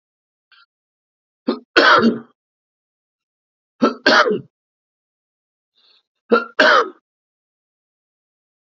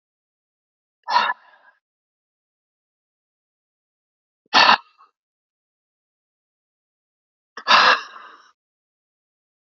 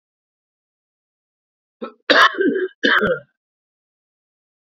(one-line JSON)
{"three_cough_length": "8.8 s", "three_cough_amplitude": 29760, "three_cough_signal_mean_std_ratio": 0.3, "exhalation_length": "9.6 s", "exhalation_amplitude": 28611, "exhalation_signal_mean_std_ratio": 0.22, "cough_length": "4.8 s", "cough_amplitude": 30940, "cough_signal_mean_std_ratio": 0.33, "survey_phase": "beta (2021-08-13 to 2022-03-07)", "age": "45-64", "gender": "Male", "wearing_mask": "No", "symptom_cough_any": true, "symptom_runny_or_blocked_nose": true, "symptom_sore_throat": true, "symptom_headache": true, "symptom_onset": "12 days", "smoker_status": "Current smoker (1 to 10 cigarettes per day)", "respiratory_condition_asthma": false, "respiratory_condition_other": false, "recruitment_source": "REACT", "submission_delay": "1 day", "covid_test_result": "Negative", "covid_test_method": "RT-qPCR", "influenza_a_test_result": "Negative", "influenza_b_test_result": "Negative"}